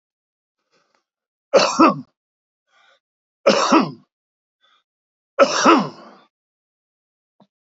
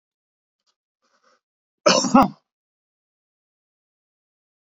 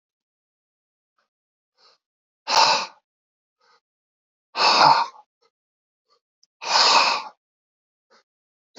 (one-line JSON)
{"three_cough_length": "7.7 s", "three_cough_amplitude": 27861, "three_cough_signal_mean_std_ratio": 0.31, "cough_length": "4.6 s", "cough_amplitude": 27478, "cough_signal_mean_std_ratio": 0.21, "exhalation_length": "8.8 s", "exhalation_amplitude": 26926, "exhalation_signal_mean_std_ratio": 0.31, "survey_phase": "beta (2021-08-13 to 2022-03-07)", "age": "65+", "gender": "Male", "wearing_mask": "No", "symptom_cough_any": true, "smoker_status": "Ex-smoker", "respiratory_condition_asthma": false, "respiratory_condition_other": true, "recruitment_source": "REACT", "submission_delay": "2 days", "covid_test_result": "Negative", "covid_test_method": "RT-qPCR", "influenza_a_test_result": "Negative", "influenza_b_test_result": "Negative"}